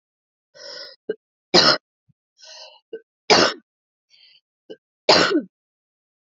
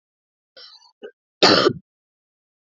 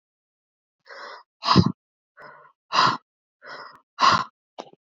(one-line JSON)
{"three_cough_length": "6.2 s", "three_cough_amplitude": 32768, "three_cough_signal_mean_std_ratio": 0.29, "cough_length": "2.7 s", "cough_amplitude": 31643, "cough_signal_mean_std_ratio": 0.27, "exhalation_length": "4.9 s", "exhalation_amplitude": 25316, "exhalation_signal_mean_std_ratio": 0.31, "survey_phase": "beta (2021-08-13 to 2022-03-07)", "age": "18-44", "gender": "Female", "wearing_mask": "No", "symptom_cough_any": true, "symptom_runny_or_blocked_nose": true, "symptom_sore_throat": true, "symptom_change_to_sense_of_smell_or_taste": true, "symptom_loss_of_taste": true, "symptom_onset": "3 days", "smoker_status": "Never smoked", "respiratory_condition_asthma": false, "respiratory_condition_other": false, "recruitment_source": "Test and Trace", "submission_delay": "2 days", "covid_test_result": "Positive", "covid_test_method": "RT-qPCR", "covid_ct_value": 21.7, "covid_ct_gene": "ORF1ab gene", "covid_ct_mean": 22.2, "covid_viral_load": "51000 copies/ml", "covid_viral_load_category": "Low viral load (10K-1M copies/ml)"}